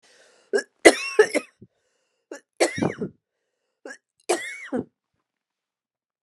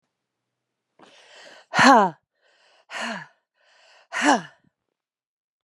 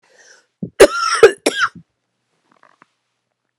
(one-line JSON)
{"three_cough_length": "6.2 s", "three_cough_amplitude": 32768, "three_cough_signal_mean_std_ratio": 0.26, "exhalation_length": "5.6 s", "exhalation_amplitude": 29027, "exhalation_signal_mean_std_ratio": 0.26, "cough_length": "3.6 s", "cough_amplitude": 32768, "cough_signal_mean_std_ratio": 0.28, "survey_phase": "beta (2021-08-13 to 2022-03-07)", "age": "65+", "gender": "Female", "wearing_mask": "No", "symptom_cough_any": true, "symptom_runny_or_blocked_nose": true, "symptom_sore_throat": true, "symptom_fatigue": true, "symptom_headache": true, "smoker_status": "Ex-smoker", "respiratory_condition_asthma": false, "respiratory_condition_other": false, "recruitment_source": "Test and Trace", "submission_delay": "1 day", "covid_test_result": "Positive", "covid_test_method": "RT-qPCR", "covid_ct_value": 15.0, "covid_ct_gene": "ORF1ab gene", "covid_ct_mean": 15.3, "covid_viral_load": "9300000 copies/ml", "covid_viral_load_category": "High viral load (>1M copies/ml)"}